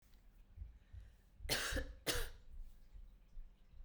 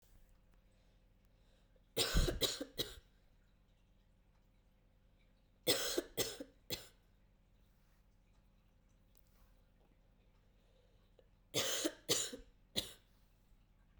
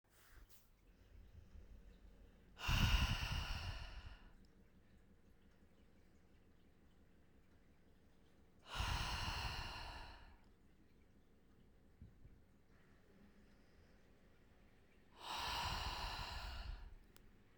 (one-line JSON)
{"cough_length": "3.8 s", "cough_amplitude": 2213, "cough_signal_mean_std_ratio": 0.57, "three_cough_length": "14.0 s", "three_cough_amplitude": 3955, "three_cough_signal_mean_std_ratio": 0.33, "exhalation_length": "17.6 s", "exhalation_amplitude": 2216, "exhalation_signal_mean_std_ratio": 0.46, "survey_phase": "beta (2021-08-13 to 2022-03-07)", "age": "18-44", "gender": "Female", "wearing_mask": "No", "symptom_cough_any": true, "symptom_runny_or_blocked_nose": true, "symptom_shortness_of_breath": true, "symptom_sore_throat": true, "symptom_fatigue": true, "symptom_headache": true, "symptom_change_to_sense_of_smell_or_taste": true, "symptom_loss_of_taste": true, "symptom_other": true, "smoker_status": "Never smoked", "respiratory_condition_asthma": false, "respiratory_condition_other": false, "recruitment_source": "Test and Trace", "submission_delay": "4 days", "covid_test_result": "Positive", "covid_test_method": "RT-qPCR", "covid_ct_value": 20.8, "covid_ct_gene": "ORF1ab gene", "covid_ct_mean": 21.6, "covid_viral_load": "82000 copies/ml", "covid_viral_load_category": "Low viral load (10K-1M copies/ml)"}